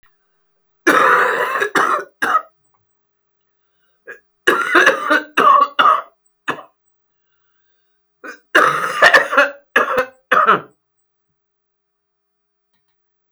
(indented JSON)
{
  "three_cough_length": "13.3 s",
  "three_cough_amplitude": 32768,
  "three_cough_signal_mean_std_ratio": 0.44,
  "survey_phase": "beta (2021-08-13 to 2022-03-07)",
  "age": "65+",
  "gender": "Female",
  "wearing_mask": "No",
  "symptom_cough_any": true,
  "symptom_runny_or_blocked_nose": true,
  "symptom_sore_throat": true,
  "symptom_fatigue": true,
  "symptom_headache": true,
  "smoker_status": "Never smoked",
  "respiratory_condition_asthma": false,
  "respiratory_condition_other": false,
  "recruitment_source": "Test and Trace",
  "submission_delay": "1 day",
  "covid_test_result": "Negative",
  "covid_test_method": "ePCR"
}